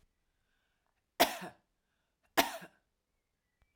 {"cough_length": "3.8 s", "cough_amplitude": 9227, "cough_signal_mean_std_ratio": 0.2, "survey_phase": "alpha (2021-03-01 to 2021-08-12)", "age": "45-64", "gender": "Female", "wearing_mask": "No", "symptom_headache": true, "symptom_onset": "6 days", "smoker_status": "Never smoked", "respiratory_condition_asthma": false, "respiratory_condition_other": false, "recruitment_source": "REACT", "submission_delay": "1 day", "covid_test_result": "Negative", "covid_test_method": "RT-qPCR"}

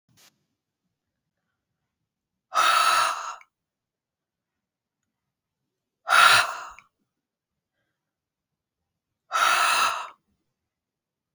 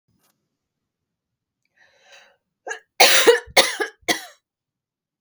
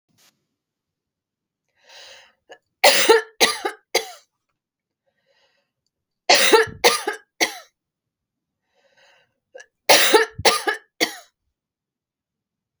{"exhalation_length": "11.3 s", "exhalation_amplitude": 21727, "exhalation_signal_mean_std_ratio": 0.32, "cough_length": "5.2 s", "cough_amplitude": 32768, "cough_signal_mean_std_ratio": 0.28, "three_cough_length": "12.8 s", "three_cough_amplitude": 32768, "three_cough_signal_mean_std_ratio": 0.3, "survey_phase": "alpha (2021-03-01 to 2021-08-12)", "age": "45-64", "gender": "Female", "wearing_mask": "No", "symptom_none": true, "smoker_status": "Ex-smoker", "respiratory_condition_asthma": false, "respiratory_condition_other": false, "recruitment_source": "REACT", "submission_delay": "3 days", "covid_test_result": "Negative", "covid_test_method": "RT-qPCR"}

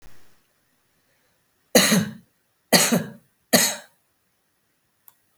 {"three_cough_length": "5.4 s", "three_cough_amplitude": 32768, "three_cough_signal_mean_std_ratio": 0.32, "survey_phase": "beta (2021-08-13 to 2022-03-07)", "age": "65+", "gender": "Female", "wearing_mask": "No", "symptom_cough_any": true, "symptom_fatigue": true, "symptom_other": true, "smoker_status": "Never smoked", "respiratory_condition_asthma": false, "respiratory_condition_other": false, "recruitment_source": "Test and Trace", "submission_delay": "1 day", "covid_test_result": "Positive", "covid_test_method": "ePCR"}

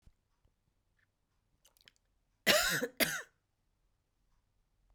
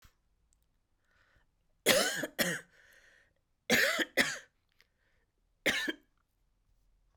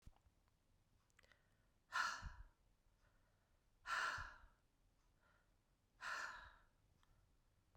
{"cough_length": "4.9 s", "cough_amplitude": 9059, "cough_signal_mean_std_ratio": 0.26, "three_cough_length": "7.2 s", "three_cough_amplitude": 10335, "three_cough_signal_mean_std_ratio": 0.34, "exhalation_length": "7.8 s", "exhalation_amplitude": 1032, "exhalation_signal_mean_std_ratio": 0.36, "survey_phase": "beta (2021-08-13 to 2022-03-07)", "age": "45-64", "gender": "Female", "wearing_mask": "No", "symptom_cough_any": true, "symptom_runny_or_blocked_nose": true, "symptom_fever_high_temperature": true, "symptom_change_to_sense_of_smell_or_taste": true, "symptom_loss_of_taste": true, "symptom_onset": "3 days", "smoker_status": "Never smoked", "respiratory_condition_asthma": true, "respiratory_condition_other": false, "recruitment_source": "Test and Trace", "submission_delay": "1 day", "covid_test_result": "Positive", "covid_test_method": "RT-qPCR"}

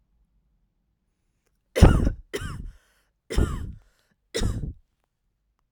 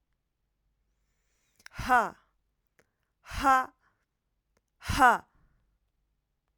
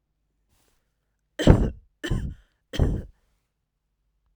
{"cough_length": "5.7 s", "cough_amplitude": 32767, "cough_signal_mean_std_ratio": 0.29, "exhalation_length": "6.6 s", "exhalation_amplitude": 12959, "exhalation_signal_mean_std_ratio": 0.26, "three_cough_length": "4.4 s", "three_cough_amplitude": 32768, "three_cough_signal_mean_std_ratio": 0.28, "survey_phase": "alpha (2021-03-01 to 2021-08-12)", "age": "18-44", "gender": "Female", "wearing_mask": "No", "symptom_none": true, "smoker_status": "Never smoked", "respiratory_condition_asthma": false, "respiratory_condition_other": false, "recruitment_source": "REACT", "submission_delay": "2 days", "covid_test_result": "Negative", "covid_test_method": "RT-qPCR"}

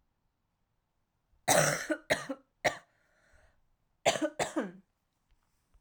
{"cough_length": "5.8 s", "cough_amplitude": 10000, "cough_signal_mean_std_ratio": 0.33, "survey_phase": "alpha (2021-03-01 to 2021-08-12)", "age": "18-44", "gender": "Female", "wearing_mask": "No", "symptom_cough_any": true, "symptom_new_continuous_cough": true, "symptom_fatigue": true, "symptom_fever_high_temperature": true, "symptom_headache": true, "symptom_onset": "3 days", "smoker_status": "Prefer not to say", "respiratory_condition_asthma": false, "respiratory_condition_other": false, "recruitment_source": "Test and Trace", "submission_delay": "1 day", "covid_test_result": "Positive", "covid_test_method": "RT-qPCR"}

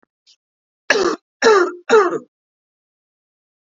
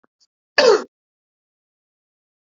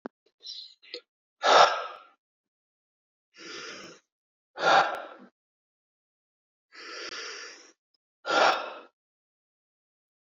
{"three_cough_length": "3.7 s", "three_cough_amplitude": 32768, "three_cough_signal_mean_std_ratio": 0.37, "cough_length": "2.5 s", "cough_amplitude": 31525, "cough_signal_mean_std_ratio": 0.24, "exhalation_length": "10.2 s", "exhalation_amplitude": 18619, "exhalation_signal_mean_std_ratio": 0.29, "survey_phase": "beta (2021-08-13 to 2022-03-07)", "age": "45-64", "gender": "Female", "wearing_mask": "Yes", "symptom_new_continuous_cough": true, "symptom_runny_or_blocked_nose": true, "symptom_fatigue": true, "symptom_other": true, "symptom_onset": "3 days", "smoker_status": "Ex-smoker", "respiratory_condition_asthma": false, "respiratory_condition_other": false, "recruitment_source": "Test and Trace", "submission_delay": "2 days", "covid_test_result": "Positive", "covid_test_method": "RT-qPCR", "covid_ct_value": 12.2, "covid_ct_gene": "ORF1ab gene"}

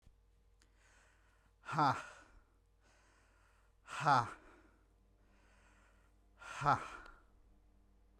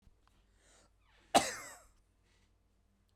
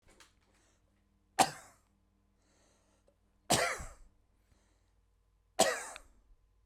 {"exhalation_length": "8.2 s", "exhalation_amplitude": 4392, "exhalation_signal_mean_std_ratio": 0.29, "cough_length": "3.2 s", "cough_amplitude": 9369, "cough_signal_mean_std_ratio": 0.19, "three_cough_length": "6.7 s", "three_cough_amplitude": 9327, "three_cough_signal_mean_std_ratio": 0.24, "survey_phase": "beta (2021-08-13 to 2022-03-07)", "age": "18-44", "gender": "Male", "wearing_mask": "No", "symptom_none": true, "smoker_status": "Ex-smoker", "respiratory_condition_asthma": false, "respiratory_condition_other": false, "recruitment_source": "REACT", "submission_delay": "1 day", "covid_test_result": "Negative", "covid_test_method": "RT-qPCR"}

